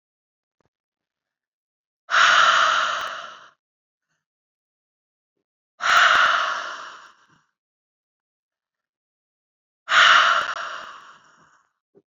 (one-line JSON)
{"exhalation_length": "12.1 s", "exhalation_amplitude": 25076, "exhalation_signal_mean_std_ratio": 0.37, "survey_phase": "beta (2021-08-13 to 2022-03-07)", "age": "18-44", "gender": "Female", "wearing_mask": "No", "symptom_cough_any": true, "symptom_fatigue": true, "symptom_headache": true, "symptom_onset": "2 days", "smoker_status": "Never smoked", "respiratory_condition_asthma": false, "respiratory_condition_other": false, "recruitment_source": "Test and Trace", "submission_delay": "2 days", "covid_test_result": "Positive", "covid_test_method": "RT-qPCR"}